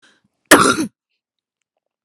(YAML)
cough_length: 2.0 s
cough_amplitude: 32768
cough_signal_mean_std_ratio: 0.29
survey_phase: beta (2021-08-13 to 2022-03-07)
age: 18-44
gender: Female
wearing_mask: 'No'
symptom_sore_throat: true
symptom_onset: 2 days
smoker_status: Ex-smoker
respiratory_condition_asthma: true
respiratory_condition_other: false
recruitment_source: REACT
submission_delay: 2 days
covid_test_result: Negative
covid_test_method: RT-qPCR